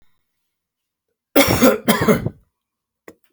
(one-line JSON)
{"cough_length": "3.3 s", "cough_amplitude": 32768, "cough_signal_mean_std_ratio": 0.37, "survey_phase": "alpha (2021-03-01 to 2021-08-12)", "age": "45-64", "gender": "Male", "wearing_mask": "No", "symptom_none": true, "smoker_status": "Ex-smoker", "respiratory_condition_asthma": false, "respiratory_condition_other": false, "recruitment_source": "REACT", "submission_delay": "1 day", "covid_test_result": "Negative", "covid_test_method": "RT-qPCR"}